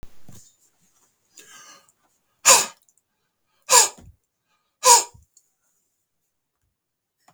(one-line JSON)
{"exhalation_length": "7.3 s", "exhalation_amplitude": 32766, "exhalation_signal_mean_std_ratio": 0.23, "survey_phase": "beta (2021-08-13 to 2022-03-07)", "age": "65+", "gender": "Male", "wearing_mask": "No", "symptom_none": true, "smoker_status": "Ex-smoker", "respiratory_condition_asthma": false, "respiratory_condition_other": false, "recruitment_source": "REACT", "submission_delay": "1 day", "covid_test_result": "Negative", "covid_test_method": "RT-qPCR", "influenza_a_test_result": "Negative", "influenza_b_test_result": "Negative"}